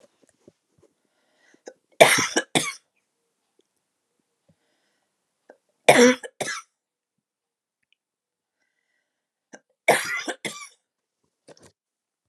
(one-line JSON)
{"three_cough_length": "12.3 s", "three_cough_amplitude": 32768, "three_cough_signal_mean_std_ratio": 0.21, "survey_phase": "alpha (2021-03-01 to 2021-08-12)", "age": "18-44", "gender": "Female", "wearing_mask": "No", "symptom_none": true, "smoker_status": "Never smoked", "respiratory_condition_asthma": false, "respiratory_condition_other": false, "recruitment_source": "REACT", "submission_delay": "6 days", "covid_test_result": "Negative", "covid_test_method": "RT-qPCR"}